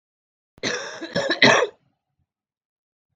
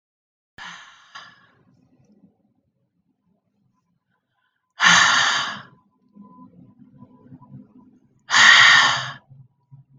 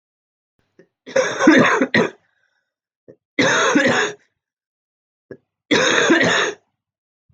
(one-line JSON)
{"cough_length": "3.2 s", "cough_amplitude": 32766, "cough_signal_mean_std_ratio": 0.34, "exhalation_length": "10.0 s", "exhalation_amplitude": 32218, "exhalation_signal_mean_std_ratio": 0.31, "three_cough_length": "7.3 s", "three_cough_amplitude": 32768, "three_cough_signal_mean_std_ratio": 0.48, "survey_phase": "beta (2021-08-13 to 2022-03-07)", "age": "18-44", "gender": "Female", "wearing_mask": "No", "symptom_cough_any": true, "symptom_sore_throat": true, "symptom_onset": "7 days", "smoker_status": "Never smoked", "respiratory_condition_asthma": false, "respiratory_condition_other": false, "recruitment_source": "Test and Trace", "submission_delay": "2 days", "covid_test_result": "Positive", "covid_test_method": "ePCR"}